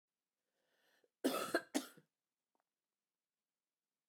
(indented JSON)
{
  "cough_length": "4.1 s",
  "cough_amplitude": 2328,
  "cough_signal_mean_std_ratio": 0.24,
  "survey_phase": "beta (2021-08-13 to 2022-03-07)",
  "age": "45-64",
  "gender": "Female",
  "wearing_mask": "No",
  "symptom_cough_any": true,
  "symptom_runny_or_blocked_nose": true,
  "symptom_sore_throat": true,
  "symptom_fatigue": true,
  "symptom_other": true,
  "smoker_status": "Never smoked",
  "respiratory_condition_asthma": true,
  "respiratory_condition_other": false,
  "recruitment_source": "Test and Trace",
  "submission_delay": "2 days",
  "covid_test_result": "Positive",
  "covid_test_method": "RT-qPCR",
  "covid_ct_value": 21.4,
  "covid_ct_gene": "N gene"
}